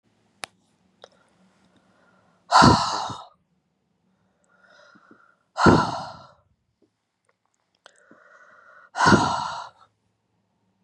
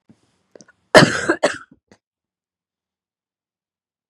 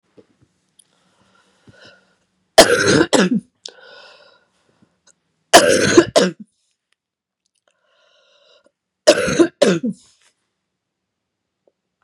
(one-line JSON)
{"exhalation_length": "10.8 s", "exhalation_amplitude": 26912, "exhalation_signal_mean_std_ratio": 0.28, "cough_length": "4.1 s", "cough_amplitude": 32768, "cough_signal_mean_std_ratio": 0.22, "three_cough_length": "12.0 s", "three_cough_amplitude": 32768, "three_cough_signal_mean_std_ratio": 0.3, "survey_phase": "beta (2021-08-13 to 2022-03-07)", "age": "65+", "gender": "Female", "wearing_mask": "No", "symptom_runny_or_blocked_nose": true, "symptom_sore_throat": true, "symptom_fatigue": true, "symptom_headache": true, "smoker_status": "Never smoked", "respiratory_condition_asthma": true, "respiratory_condition_other": false, "recruitment_source": "Test and Trace", "submission_delay": "2 days", "covid_test_result": "Positive", "covid_test_method": "LFT"}